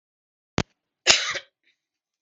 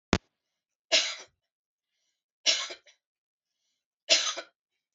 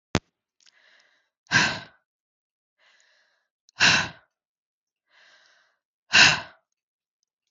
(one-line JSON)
{"cough_length": "2.2 s", "cough_amplitude": 32768, "cough_signal_mean_std_ratio": 0.25, "three_cough_length": "4.9 s", "three_cough_amplitude": 32767, "three_cough_signal_mean_std_ratio": 0.27, "exhalation_length": "7.5 s", "exhalation_amplitude": 32767, "exhalation_signal_mean_std_ratio": 0.24, "survey_phase": "beta (2021-08-13 to 2022-03-07)", "age": "45-64", "gender": "Female", "wearing_mask": "No", "symptom_none": true, "smoker_status": "Current smoker (11 or more cigarettes per day)", "respiratory_condition_asthma": false, "respiratory_condition_other": false, "recruitment_source": "REACT", "submission_delay": "5 days", "covid_test_result": "Negative", "covid_test_method": "RT-qPCR", "influenza_a_test_result": "Negative", "influenza_b_test_result": "Negative"}